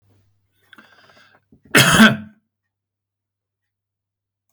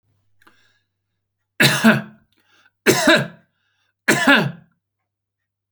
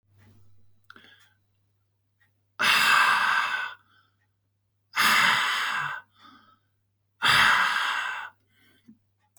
{"cough_length": "4.5 s", "cough_amplitude": 32768, "cough_signal_mean_std_ratio": 0.25, "three_cough_length": "5.7 s", "three_cough_amplitude": 31129, "three_cough_signal_mean_std_ratio": 0.35, "exhalation_length": "9.4 s", "exhalation_amplitude": 14255, "exhalation_signal_mean_std_ratio": 0.48, "survey_phase": "beta (2021-08-13 to 2022-03-07)", "age": "45-64", "gender": "Male", "wearing_mask": "No", "symptom_none": true, "smoker_status": "Never smoked", "respiratory_condition_asthma": false, "respiratory_condition_other": false, "recruitment_source": "REACT", "submission_delay": "15 days", "covid_test_result": "Negative", "covid_test_method": "RT-qPCR"}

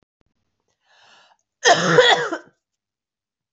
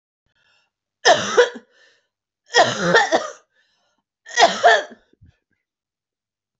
{"cough_length": "3.5 s", "cough_amplitude": 29403, "cough_signal_mean_std_ratio": 0.33, "three_cough_length": "6.6 s", "three_cough_amplitude": 27783, "three_cough_signal_mean_std_ratio": 0.35, "survey_phase": "beta (2021-08-13 to 2022-03-07)", "age": "45-64", "gender": "Female", "wearing_mask": "No", "symptom_cough_any": true, "symptom_runny_or_blocked_nose": true, "symptom_shortness_of_breath": true, "symptom_abdominal_pain": true, "symptom_fatigue": true, "symptom_fever_high_temperature": true, "symptom_headache": true, "symptom_onset": "4 days", "smoker_status": "Never smoked", "respiratory_condition_asthma": true, "respiratory_condition_other": false, "recruitment_source": "Test and Trace", "submission_delay": "2 days", "covid_test_result": "Positive", "covid_test_method": "RT-qPCR"}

